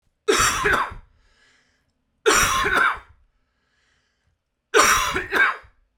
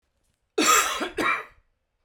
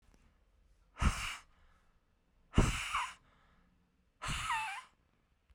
{"three_cough_length": "6.0 s", "three_cough_amplitude": 29411, "three_cough_signal_mean_std_ratio": 0.49, "cough_length": "2.0 s", "cough_amplitude": 17386, "cough_signal_mean_std_ratio": 0.49, "exhalation_length": "5.5 s", "exhalation_amplitude": 7052, "exhalation_signal_mean_std_ratio": 0.37, "survey_phase": "beta (2021-08-13 to 2022-03-07)", "age": "45-64", "gender": "Male", "wearing_mask": "No", "symptom_none": true, "smoker_status": "Ex-smoker", "respiratory_condition_asthma": false, "respiratory_condition_other": false, "recruitment_source": "Test and Trace", "submission_delay": "1 day", "covid_test_method": "RT-qPCR"}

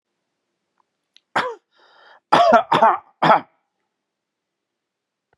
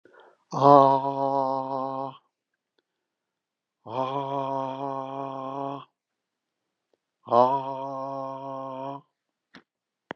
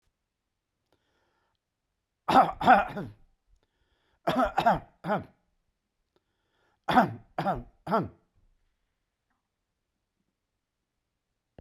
{"cough_length": "5.4 s", "cough_amplitude": 32760, "cough_signal_mean_std_ratio": 0.31, "exhalation_length": "10.2 s", "exhalation_amplitude": 25199, "exhalation_signal_mean_std_ratio": 0.39, "three_cough_length": "11.6 s", "three_cough_amplitude": 16430, "three_cough_signal_mean_std_ratio": 0.28, "survey_phase": "beta (2021-08-13 to 2022-03-07)", "age": "65+", "gender": "Male", "wearing_mask": "No", "symptom_none": true, "smoker_status": "Ex-smoker", "respiratory_condition_asthma": false, "respiratory_condition_other": false, "recruitment_source": "REACT", "submission_delay": "0 days", "covid_test_result": "Negative", "covid_test_method": "RT-qPCR"}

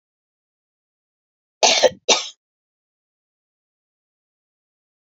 {"cough_length": "5.0 s", "cough_amplitude": 28652, "cough_signal_mean_std_ratio": 0.21, "survey_phase": "beta (2021-08-13 to 2022-03-07)", "age": "45-64", "gender": "Female", "wearing_mask": "No", "symptom_none": true, "smoker_status": "Ex-smoker", "respiratory_condition_asthma": false, "respiratory_condition_other": false, "recruitment_source": "REACT", "submission_delay": "1 day", "covid_test_result": "Negative", "covid_test_method": "RT-qPCR"}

